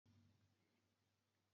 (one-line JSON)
{"three_cough_length": "1.5 s", "three_cough_amplitude": 20, "three_cough_signal_mean_std_ratio": 0.75, "survey_phase": "beta (2021-08-13 to 2022-03-07)", "age": "65+", "gender": "Female", "wearing_mask": "No", "symptom_change_to_sense_of_smell_or_taste": true, "symptom_loss_of_taste": true, "smoker_status": "Never smoked", "respiratory_condition_asthma": false, "respiratory_condition_other": false, "recruitment_source": "REACT", "submission_delay": "0 days", "covid_test_result": "Negative", "covid_test_method": "RT-qPCR", "influenza_a_test_result": "Negative", "influenza_b_test_result": "Negative"}